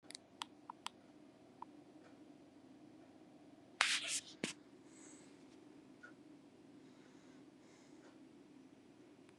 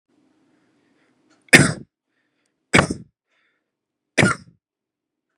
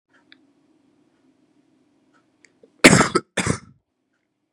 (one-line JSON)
{"exhalation_length": "9.4 s", "exhalation_amplitude": 8984, "exhalation_signal_mean_std_ratio": 0.37, "three_cough_length": "5.4 s", "three_cough_amplitude": 32768, "three_cough_signal_mean_std_ratio": 0.22, "cough_length": "4.5 s", "cough_amplitude": 32768, "cough_signal_mean_std_ratio": 0.21, "survey_phase": "beta (2021-08-13 to 2022-03-07)", "age": "18-44", "gender": "Male", "wearing_mask": "No", "symptom_shortness_of_breath": true, "symptom_fever_high_temperature": true, "symptom_headache": true, "symptom_onset": "4 days", "smoker_status": "Current smoker (11 or more cigarettes per day)", "recruitment_source": "Test and Trace", "submission_delay": "1 day", "covid_test_result": "Positive", "covid_test_method": "ePCR"}